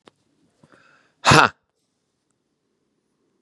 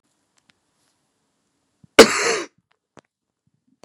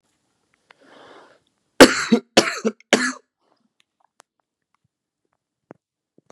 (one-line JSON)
{"exhalation_length": "3.4 s", "exhalation_amplitude": 32768, "exhalation_signal_mean_std_ratio": 0.19, "cough_length": "3.8 s", "cough_amplitude": 32768, "cough_signal_mean_std_ratio": 0.19, "three_cough_length": "6.3 s", "three_cough_amplitude": 32768, "three_cough_signal_mean_std_ratio": 0.21, "survey_phase": "beta (2021-08-13 to 2022-03-07)", "age": "18-44", "gender": "Male", "wearing_mask": "No", "symptom_cough_any": true, "symptom_new_continuous_cough": true, "symptom_runny_or_blocked_nose": true, "symptom_sore_throat": true, "symptom_diarrhoea": true, "symptom_other": true, "symptom_onset": "3 days", "smoker_status": "Never smoked", "respiratory_condition_asthma": false, "respiratory_condition_other": false, "recruitment_source": "Test and Trace", "submission_delay": "1 day", "covid_test_result": "Positive", "covid_test_method": "RT-qPCR", "covid_ct_value": 23.7, "covid_ct_gene": "N gene"}